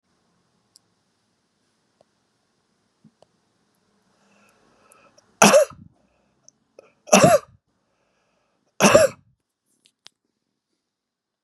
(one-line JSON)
{"cough_length": "11.4 s", "cough_amplitude": 32768, "cough_signal_mean_std_ratio": 0.21, "survey_phase": "beta (2021-08-13 to 2022-03-07)", "age": "65+", "gender": "Male", "wearing_mask": "No", "symptom_none": true, "smoker_status": "Never smoked", "respiratory_condition_asthma": false, "respiratory_condition_other": false, "recruitment_source": "REACT", "submission_delay": "2 days", "covid_test_result": "Negative", "covid_test_method": "RT-qPCR", "influenza_a_test_result": "Negative", "influenza_b_test_result": "Negative"}